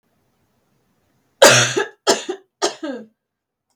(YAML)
cough_length: 3.8 s
cough_amplitude: 32768
cough_signal_mean_std_ratio: 0.32
survey_phase: beta (2021-08-13 to 2022-03-07)
age: 18-44
gender: Female
wearing_mask: 'No'
symptom_cough_any: true
symptom_runny_or_blocked_nose: true
symptom_change_to_sense_of_smell_or_taste: true
symptom_onset: 8 days
smoker_status: Never smoked
respiratory_condition_asthma: false
respiratory_condition_other: false
recruitment_source: REACT
submission_delay: 2 days
covid_test_result: Negative
covid_test_method: RT-qPCR
influenza_a_test_result: Negative
influenza_b_test_result: Negative